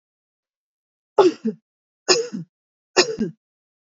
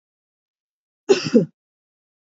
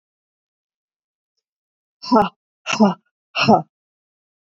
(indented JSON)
{
  "three_cough_length": "3.9 s",
  "three_cough_amplitude": 28038,
  "three_cough_signal_mean_std_ratio": 0.3,
  "cough_length": "2.3 s",
  "cough_amplitude": 25964,
  "cough_signal_mean_std_ratio": 0.24,
  "exhalation_length": "4.4 s",
  "exhalation_amplitude": 28538,
  "exhalation_signal_mean_std_ratio": 0.29,
  "survey_phase": "beta (2021-08-13 to 2022-03-07)",
  "age": "45-64",
  "gender": "Female",
  "wearing_mask": "No",
  "symptom_none": true,
  "smoker_status": "Ex-smoker",
  "respiratory_condition_asthma": false,
  "respiratory_condition_other": false,
  "recruitment_source": "REACT",
  "submission_delay": "0 days",
  "covid_test_result": "Negative",
  "covid_test_method": "RT-qPCR"
}